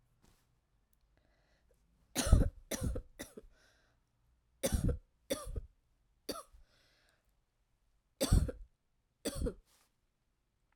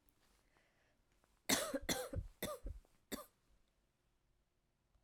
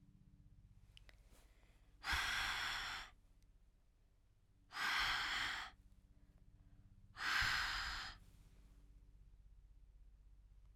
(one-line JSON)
{"three_cough_length": "10.8 s", "three_cough_amplitude": 9804, "three_cough_signal_mean_std_ratio": 0.28, "cough_length": "5.0 s", "cough_amplitude": 2954, "cough_signal_mean_std_ratio": 0.34, "exhalation_length": "10.8 s", "exhalation_amplitude": 1622, "exhalation_signal_mean_std_ratio": 0.51, "survey_phase": "beta (2021-08-13 to 2022-03-07)", "age": "45-64", "gender": "Female", "wearing_mask": "No", "symptom_cough_any": true, "symptom_runny_or_blocked_nose": true, "symptom_sore_throat": true, "symptom_fatigue": true, "symptom_headache": true, "symptom_other": true, "symptom_onset": "3 days", "smoker_status": "Never smoked", "respiratory_condition_asthma": false, "respiratory_condition_other": false, "recruitment_source": "Test and Trace", "submission_delay": "2 days", "covid_test_result": "Positive", "covid_test_method": "RT-qPCR", "covid_ct_value": 14.9, "covid_ct_gene": "ORF1ab gene", "covid_ct_mean": 15.2, "covid_viral_load": "11000000 copies/ml", "covid_viral_load_category": "High viral load (>1M copies/ml)"}